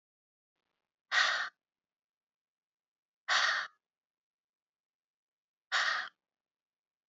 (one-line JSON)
{"exhalation_length": "7.1 s", "exhalation_amplitude": 5641, "exhalation_signal_mean_std_ratio": 0.3, "survey_phase": "beta (2021-08-13 to 2022-03-07)", "age": "45-64", "gender": "Female", "wearing_mask": "No", "symptom_headache": true, "smoker_status": "Ex-smoker", "respiratory_condition_asthma": false, "respiratory_condition_other": false, "recruitment_source": "REACT", "submission_delay": "1 day", "covid_test_result": "Negative", "covid_test_method": "RT-qPCR"}